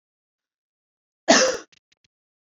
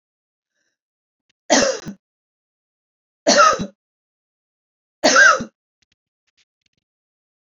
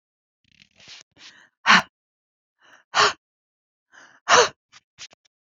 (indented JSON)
{
  "cough_length": "2.6 s",
  "cough_amplitude": 25807,
  "cough_signal_mean_std_ratio": 0.25,
  "three_cough_length": "7.5 s",
  "three_cough_amplitude": 31175,
  "three_cough_signal_mean_std_ratio": 0.29,
  "exhalation_length": "5.5 s",
  "exhalation_amplitude": 27469,
  "exhalation_signal_mean_std_ratio": 0.25,
  "survey_phase": "beta (2021-08-13 to 2022-03-07)",
  "age": "45-64",
  "gender": "Female",
  "wearing_mask": "No",
  "symptom_headache": true,
  "smoker_status": "Ex-smoker",
  "respiratory_condition_asthma": false,
  "respiratory_condition_other": false,
  "recruitment_source": "REACT",
  "submission_delay": "2 days",
  "covid_test_result": "Negative",
  "covid_test_method": "RT-qPCR"
}